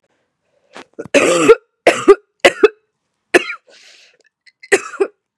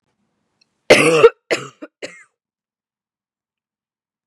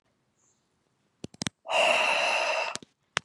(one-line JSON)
{"cough_length": "5.4 s", "cough_amplitude": 32768, "cough_signal_mean_std_ratio": 0.33, "three_cough_length": "4.3 s", "three_cough_amplitude": 32768, "three_cough_signal_mean_std_ratio": 0.25, "exhalation_length": "3.2 s", "exhalation_amplitude": 22653, "exhalation_signal_mean_std_ratio": 0.5, "survey_phase": "beta (2021-08-13 to 2022-03-07)", "age": "18-44", "gender": "Female", "wearing_mask": "Yes", "symptom_cough_any": true, "symptom_new_continuous_cough": true, "symptom_runny_or_blocked_nose": true, "symptom_shortness_of_breath": true, "symptom_sore_throat": true, "symptom_fatigue": true, "symptom_fever_high_temperature": true, "symptom_headache": true, "symptom_onset": "3 days", "smoker_status": "Never smoked", "respiratory_condition_asthma": false, "respiratory_condition_other": false, "recruitment_source": "Test and Trace", "submission_delay": "1 day", "covid_test_result": "Positive", "covid_test_method": "ePCR"}